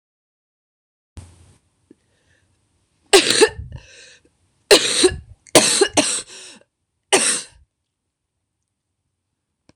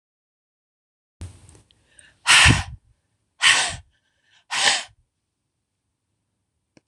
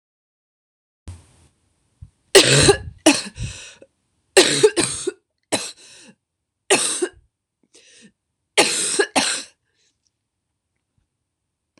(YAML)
cough_length: 9.8 s
cough_amplitude: 26028
cough_signal_mean_std_ratio: 0.3
exhalation_length: 6.9 s
exhalation_amplitude: 26028
exhalation_signal_mean_std_ratio: 0.29
three_cough_length: 11.8 s
three_cough_amplitude: 26028
three_cough_signal_mean_std_ratio: 0.33
survey_phase: beta (2021-08-13 to 2022-03-07)
age: 18-44
gender: Female
wearing_mask: 'No'
symptom_cough_any: true
symptom_new_continuous_cough: true
symptom_runny_or_blocked_nose: true
symptom_shortness_of_breath: true
symptom_sore_throat: true
symptom_abdominal_pain: true
symptom_fatigue: true
symptom_fever_high_temperature: true
symptom_headache: true
symptom_onset: 3 days
smoker_status: Never smoked
respiratory_condition_asthma: false
respiratory_condition_other: false
recruitment_source: Test and Trace
submission_delay: 1 day
covid_test_result: Negative
covid_test_method: ePCR